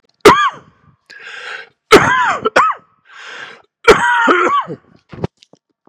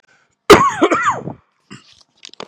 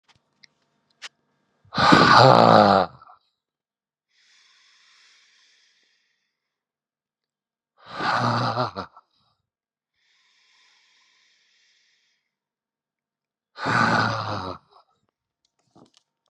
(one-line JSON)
{"three_cough_length": "5.9 s", "three_cough_amplitude": 32768, "three_cough_signal_mean_std_ratio": 0.46, "cough_length": "2.5 s", "cough_amplitude": 32768, "cough_signal_mean_std_ratio": 0.38, "exhalation_length": "16.3 s", "exhalation_amplitude": 32742, "exhalation_signal_mean_std_ratio": 0.28, "survey_phase": "beta (2021-08-13 to 2022-03-07)", "age": "45-64", "gender": "Male", "wearing_mask": "No", "symptom_cough_any": true, "symptom_runny_or_blocked_nose": true, "symptom_shortness_of_breath": true, "symptom_fatigue": true, "symptom_fever_high_temperature": true, "symptom_headache": true, "symptom_onset": "4 days", "smoker_status": "Ex-smoker", "respiratory_condition_asthma": false, "respiratory_condition_other": false, "recruitment_source": "Test and Trace", "submission_delay": "2 days", "covid_test_result": "Positive", "covid_test_method": "RT-qPCR", "covid_ct_value": 26.9, "covid_ct_gene": "ORF1ab gene", "covid_ct_mean": 27.6, "covid_viral_load": "870 copies/ml", "covid_viral_load_category": "Minimal viral load (< 10K copies/ml)"}